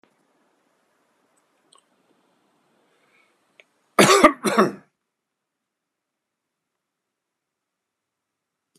{"cough_length": "8.8 s", "cough_amplitude": 32767, "cough_signal_mean_std_ratio": 0.19, "survey_phase": "beta (2021-08-13 to 2022-03-07)", "age": "45-64", "gender": "Male", "wearing_mask": "No", "symptom_none": true, "smoker_status": "Current smoker (1 to 10 cigarettes per day)", "respiratory_condition_asthma": false, "respiratory_condition_other": false, "recruitment_source": "REACT", "submission_delay": "6 days", "covid_test_result": "Negative", "covid_test_method": "RT-qPCR"}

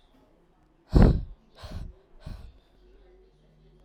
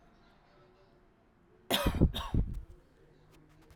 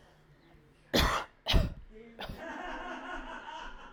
{"exhalation_length": "3.8 s", "exhalation_amplitude": 20494, "exhalation_signal_mean_std_ratio": 0.26, "cough_length": "3.8 s", "cough_amplitude": 9443, "cough_signal_mean_std_ratio": 0.35, "three_cough_length": "3.9 s", "three_cough_amplitude": 8212, "three_cough_signal_mean_std_ratio": 0.48, "survey_phase": "alpha (2021-03-01 to 2021-08-12)", "age": "18-44", "gender": "Female", "wearing_mask": "No", "symptom_none": true, "smoker_status": "Current smoker (1 to 10 cigarettes per day)", "respiratory_condition_asthma": false, "respiratory_condition_other": false, "recruitment_source": "REACT", "submission_delay": "1 day", "covid_test_result": "Negative", "covid_test_method": "RT-qPCR"}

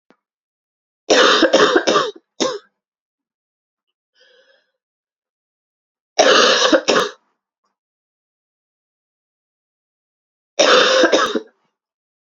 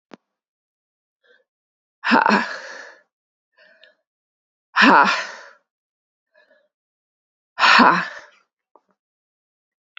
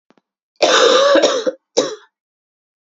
{"three_cough_length": "12.4 s", "three_cough_amplitude": 32767, "three_cough_signal_mean_std_ratio": 0.37, "exhalation_length": "10.0 s", "exhalation_amplitude": 32768, "exhalation_signal_mean_std_ratio": 0.29, "cough_length": "2.8 s", "cough_amplitude": 30594, "cough_signal_mean_std_ratio": 0.52, "survey_phase": "beta (2021-08-13 to 2022-03-07)", "age": "18-44", "gender": "Female", "wearing_mask": "No", "symptom_cough_any": true, "symptom_runny_or_blocked_nose": true, "symptom_shortness_of_breath": true, "symptom_sore_throat": true, "symptom_fatigue": true, "symptom_headache": true, "symptom_onset": "2 days", "smoker_status": "Never smoked", "respiratory_condition_asthma": false, "respiratory_condition_other": false, "recruitment_source": "Test and Trace", "submission_delay": "1 day", "covid_test_result": "Positive", "covid_test_method": "RT-qPCR", "covid_ct_value": 21.1, "covid_ct_gene": "ORF1ab gene", "covid_ct_mean": 21.4, "covid_viral_load": "94000 copies/ml", "covid_viral_load_category": "Low viral load (10K-1M copies/ml)"}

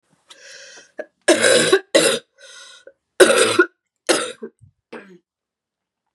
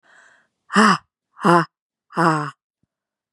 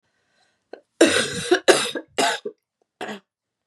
{"cough_length": "6.1 s", "cough_amplitude": 32768, "cough_signal_mean_std_ratio": 0.38, "exhalation_length": "3.3 s", "exhalation_amplitude": 32192, "exhalation_signal_mean_std_ratio": 0.35, "three_cough_length": "3.7 s", "three_cough_amplitude": 32767, "three_cough_signal_mean_std_ratio": 0.39, "survey_phase": "beta (2021-08-13 to 2022-03-07)", "age": "18-44", "gender": "Female", "wearing_mask": "No", "symptom_cough_any": true, "symptom_new_continuous_cough": true, "symptom_runny_or_blocked_nose": true, "symptom_shortness_of_breath": true, "symptom_fatigue": true, "symptom_headache": true, "symptom_onset": "3 days", "smoker_status": "Never smoked", "respiratory_condition_asthma": false, "respiratory_condition_other": false, "recruitment_source": "Test and Trace", "submission_delay": "1 day", "covid_test_result": "Positive", "covid_test_method": "RT-qPCR", "covid_ct_value": 18.2, "covid_ct_gene": "ORF1ab gene", "covid_ct_mean": 18.8, "covid_viral_load": "710000 copies/ml", "covid_viral_load_category": "Low viral load (10K-1M copies/ml)"}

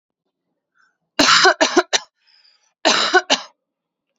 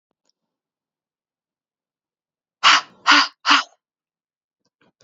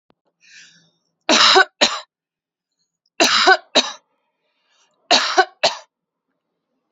{"cough_length": "4.2 s", "cough_amplitude": 32477, "cough_signal_mean_std_ratio": 0.38, "exhalation_length": "5.0 s", "exhalation_amplitude": 32298, "exhalation_signal_mean_std_ratio": 0.25, "three_cough_length": "6.9 s", "three_cough_amplitude": 31557, "three_cough_signal_mean_std_ratio": 0.35, "survey_phase": "beta (2021-08-13 to 2022-03-07)", "age": "18-44", "gender": "Female", "wearing_mask": "No", "symptom_cough_any": true, "symptom_runny_or_blocked_nose": true, "symptom_fatigue": true, "symptom_headache": true, "symptom_change_to_sense_of_smell_or_taste": true, "symptom_onset": "4 days", "smoker_status": "Never smoked", "respiratory_condition_asthma": false, "respiratory_condition_other": false, "recruitment_source": "Test and Trace", "submission_delay": "1 day", "covid_test_result": "Positive", "covid_test_method": "RT-qPCR"}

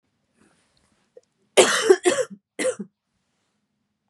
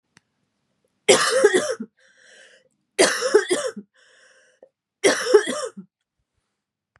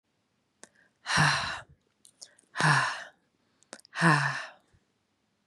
{"cough_length": "4.1 s", "cough_amplitude": 32748, "cough_signal_mean_std_ratio": 0.3, "three_cough_length": "7.0 s", "three_cough_amplitude": 30228, "three_cough_signal_mean_std_ratio": 0.38, "exhalation_length": "5.5 s", "exhalation_amplitude": 14340, "exhalation_signal_mean_std_ratio": 0.39, "survey_phase": "beta (2021-08-13 to 2022-03-07)", "age": "18-44", "gender": "Female", "wearing_mask": "No", "symptom_cough_any": true, "symptom_runny_or_blocked_nose": true, "symptom_shortness_of_breath": true, "smoker_status": "Never smoked", "respiratory_condition_asthma": false, "respiratory_condition_other": false, "recruitment_source": "Test and Trace", "submission_delay": "2 days", "covid_test_result": "Positive", "covid_test_method": "LFT"}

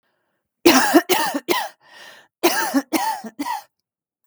{"cough_length": "4.3 s", "cough_amplitude": 32768, "cough_signal_mean_std_ratio": 0.47, "survey_phase": "beta (2021-08-13 to 2022-03-07)", "age": "45-64", "gender": "Female", "wearing_mask": "No", "symptom_none": true, "smoker_status": "Never smoked", "respiratory_condition_asthma": false, "respiratory_condition_other": false, "recruitment_source": "REACT", "submission_delay": "1 day", "covid_test_result": "Negative", "covid_test_method": "RT-qPCR"}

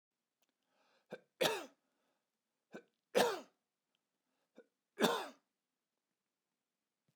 {"three_cough_length": "7.2 s", "three_cough_amplitude": 5612, "three_cough_signal_mean_std_ratio": 0.24, "survey_phase": "beta (2021-08-13 to 2022-03-07)", "age": "45-64", "gender": "Male", "wearing_mask": "No", "symptom_none": true, "smoker_status": "Never smoked", "respiratory_condition_asthma": false, "respiratory_condition_other": false, "recruitment_source": "REACT", "submission_delay": "1 day", "covid_test_result": "Negative", "covid_test_method": "RT-qPCR"}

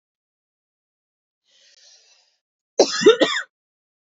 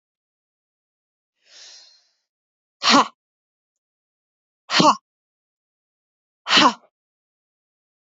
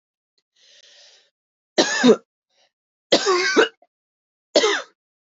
{"cough_length": "4.1 s", "cough_amplitude": 27413, "cough_signal_mean_std_ratio": 0.24, "exhalation_length": "8.2 s", "exhalation_amplitude": 28373, "exhalation_signal_mean_std_ratio": 0.22, "three_cough_length": "5.4 s", "three_cough_amplitude": 25631, "three_cough_signal_mean_std_ratio": 0.35, "survey_phase": "beta (2021-08-13 to 2022-03-07)", "age": "18-44", "gender": "Female", "wearing_mask": "No", "symptom_runny_or_blocked_nose": true, "symptom_onset": "12 days", "smoker_status": "Never smoked", "respiratory_condition_asthma": true, "respiratory_condition_other": false, "recruitment_source": "REACT", "submission_delay": "0 days", "covid_test_result": "Negative", "covid_test_method": "RT-qPCR", "influenza_a_test_result": "Negative", "influenza_b_test_result": "Negative"}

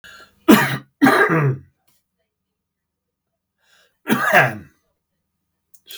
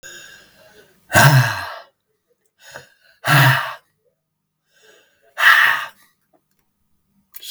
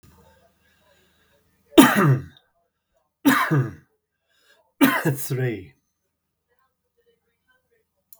{"cough_length": "6.0 s", "cough_amplitude": 32768, "cough_signal_mean_std_ratio": 0.36, "exhalation_length": "7.5 s", "exhalation_amplitude": 32768, "exhalation_signal_mean_std_ratio": 0.35, "three_cough_length": "8.2 s", "three_cough_amplitude": 32768, "three_cough_signal_mean_std_ratio": 0.31, "survey_phase": "beta (2021-08-13 to 2022-03-07)", "age": "65+", "gender": "Male", "wearing_mask": "No", "symptom_none": true, "smoker_status": "Ex-smoker", "respiratory_condition_asthma": false, "respiratory_condition_other": false, "recruitment_source": "REACT", "submission_delay": "2 days", "covid_test_result": "Negative", "covid_test_method": "RT-qPCR"}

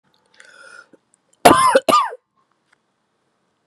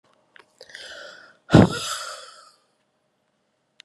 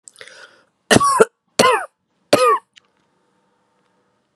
{"cough_length": "3.7 s", "cough_amplitude": 32768, "cough_signal_mean_std_ratio": 0.31, "exhalation_length": "3.8 s", "exhalation_amplitude": 32768, "exhalation_signal_mean_std_ratio": 0.23, "three_cough_length": "4.4 s", "three_cough_amplitude": 32768, "three_cough_signal_mean_std_ratio": 0.34, "survey_phase": "beta (2021-08-13 to 2022-03-07)", "age": "18-44", "gender": "Female", "wearing_mask": "No", "symptom_cough_any": true, "symptom_new_continuous_cough": true, "symptom_runny_or_blocked_nose": true, "symptom_shortness_of_breath": true, "symptom_sore_throat": true, "symptom_fatigue": true, "symptom_fever_high_temperature": true, "symptom_headache": true, "symptom_change_to_sense_of_smell_or_taste": true, "symptom_onset": "4 days", "smoker_status": "Ex-smoker", "respiratory_condition_asthma": false, "respiratory_condition_other": false, "recruitment_source": "Test and Trace", "submission_delay": "2 days", "covid_test_method": "RT-qPCR", "covid_ct_value": 27.9, "covid_ct_gene": "ORF1ab gene"}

